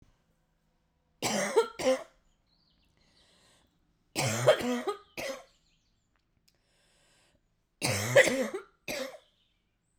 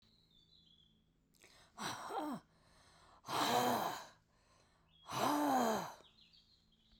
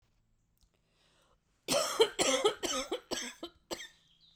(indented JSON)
{
  "three_cough_length": "10.0 s",
  "three_cough_amplitude": 13744,
  "three_cough_signal_mean_std_ratio": 0.35,
  "exhalation_length": "7.0 s",
  "exhalation_amplitude": 2777,
  "exhalation_signal_mean_std_ratio": 0.46,
  "cough_length": "4.4 s",
  "cough_amplitude": 9291,
  "cough_signal_mean_std_ratio": 0.42,
  "survey_phase": "beta (2021-08-13 to 2022-03-07)",
  "age": "45-64",
  "gender": "Female",
  "wearing_mask": "No",
  "symptom_cough_any": true,
  "symptom_runny_or_blocked_nose": true,
  "symptom_shortness_of_breath": true,
  "symptom_fatigue": true,
  "symptom_headache": true,
  "symptom_change_to_sense_of_smell_or_taste": true,
  "symptom_loss_of_taste": true,
  "symptom_onset": "2 days",
  "smoker_status": "Never smoked",
  "respiratory_condition_asthma": false,
  "respiratory_condition_other": false,
  "recruitment_source": "Test and Trace",
  "submission_delay": "2 days",
  "covid_test_result": "Positive",
  "covid_test_method": "RT-qPCR",
  "covid_ct_value": 26.3,
  "covid_ct_gene": "ORF1ab gene",
  "covid_ct_mean": 26.7,
  "covid_viral_load": "1700 copies/ml",
  "covid_viral_load_category": "Minimal viral load (< 10K copies/ml)"
}